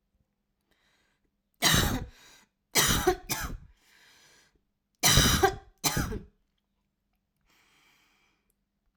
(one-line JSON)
{"three_cough_length": "9.0 s", "three_cough_amplitude": 13529, "three_cough_signal_mean_std_ratio": 0.35, "survey_phase": "alpha (2021-03-01 to 2021-08-12)", "age": "18-44", "gender": "Female", "wearing_mask": "No", "symptom_new_continuous_cough": true, "symptom_onset": "6 days", "smoker_status": "Never smoked", "respiratory_condition_asthma": false, "respiratory_condition_other": false, "recruitment_source": "REACT", "submission_delay": "2 days", "covid_test_result": "Negative", "covid_test_method": "RT-qPCR"}